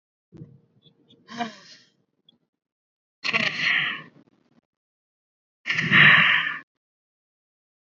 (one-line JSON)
{"exhalation_length": "7.9 s", "exhalation_amplitude": 24155, "exhalation_signal_mean_std_ratio": 0.33, "survey_phase": "beta (2021-08-13 to 2022-03-07)", "age": "18-44", "gender": "Female", "wearing_mask": "No", "symptom_none": true, "smoker_status": "Never smoked", "respiratory_condition_asthma": false, "respiratory_condition_other": false, "recruitment_source": "REACT", "submission_delay": "9 days", "covid_test_result": "Negative", "covid_test_method": "RT-qPCR"}